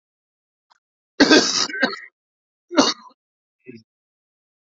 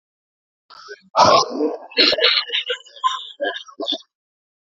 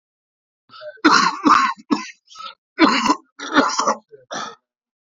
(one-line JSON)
{"cough_length": "4.7 s", "cough_amplitude": 29559, "cough_signal_mean_std_ratio": 0.3, "exhalation_length": "4.6 s", "exhalation_amplitude": 32768, "exhalation_signal_mean_std_ratio": 0.48, "three_cough_length": "5.0 s", "three_cough_amplitude": 28825, "three_cough_signal_mean_std_ratio": 0.46, "survey_phase": "beta (2021-08-13 to 2022-03-07)", "age": "45-64", "gender": "Male", "wearing_mask": "No", "symptom_runny_or_blocked_nose": true, "symptom_abdominal_pain": true, "symptom_diarrhoea": true, "symptom_fever_high_temperature": true, "symptom_headache": true, "symptom_change_to_sense_of_smell_or_taste": true, "symptom_loss_of_taste": true, "symptom_onset": "9 days", "smoker_status": "Ex-smoker", "respiratory_condition_asthma": false, "respiratory_condition_other": false, "recruitment_source": "Test and Trace", "submission_delay": "1 day", "covid_test_result": "Positive", "covid_test_method": "RT-qPCR"}